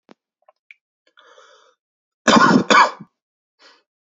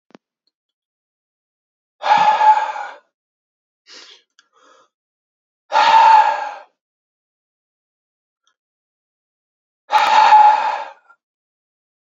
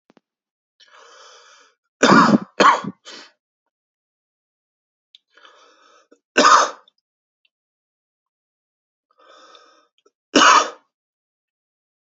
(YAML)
cough_length: 4.1 s
cough_amplitude: 28996
cough_signal_mean_std_ratio: 0.3
exhalation_length: 12.1 s
exhalation_amplitude: 29186
exhalation_signal_mean_std_ratio: 0.36
three_cough_length: 12.0 s
three_cough_amplitude: 32768
three_cough_signal_mean_std_ratio: 0.26
survey_phase: beta (2021-08-13 to 2022-03-07)
age: 18-44
gender: Male
wearing_mask: 'No'
symptom_cough_any: true
symptom_runny_or_blocked_nose: true
symptom_sore_throat: true
symptom_fever_high_temperature: true
symptom_headache: true
symptom_other: true
smoker_status: Never smoked
respiratory_condition_asthma: false
respiratory_condition_other: false
recruitment_source: Test and Trace
submission_delay: 2 days
covid_test_result: Positive
covid_test_method: ePCR